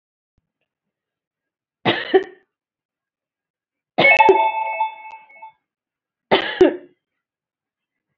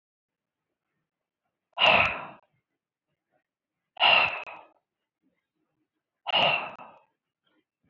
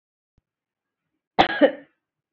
{"three_cough_length": "8.2 s", "three_cough_amplitude": 27607, "three_cough_signal_mean_std_ratio": 0.32, "exhalation_length": "7.9 s", "exhalation_amplitude": 14039, "exhalation_signal_mean_std_ratio": 0.3, "cough_length": "2.3 s", "cough_amplitude": 26295, "cough_signal_mean_std_ratio": 0.24, "survey_phase": "beta (2021-08-13 to 2022-03-07)", "age": "45-64", "gender": "Female", "wearing_mask": "No", "symptom_cough_any": true, "symptom_sore_throat": true, "smoker_status": "Ex-smoker", "respiratory_condition_asthma": false, "respiratory_condition_other": false, "recruitment_source": "Test and Trace", "submission_delay": "2 days", "covid_test_result": "Positive", "covid_test_method": "RT-qPCR", "covid_ct_value": 23.6, "covid_ct_gene": "N gene"}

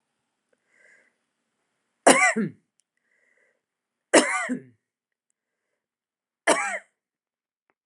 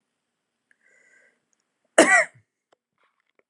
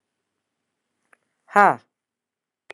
{"three_cough_length": "7.9 s", "three_cough_amplitude": 29261, "three_cough_signal_mean_std_ratio": 0.25, "cough_length": "3.5 s", "cough_amplitude": 29582, "cough_signal_mean_std_ratio": 0.21, "exhalation_length": "2.7 s", "exhalation_amplitude": 31503, "exhalation_signal_mean_std_ratio": 0.17, "survey_phase": "beta (2021-08-13 to 2022-03-07)", "age": "45-64", "gender": "Female", "wearing_mask": "No", "symptom_cough_any": true, "symptom_shortness_of_breath": true, "symptom_headache": true, "smoker_status": "Ex-smoker", "respiratory_condition_asthma": true, "respiratory_condition_other": false, "recruitment_source": "REACT", "submission_delay": "4 days", "covid_test_result": "Negative", "covid_test_method": "RT-qPCR", "influenza_a_test_result": "Negative", "influenza_b_test_result": "Negative"}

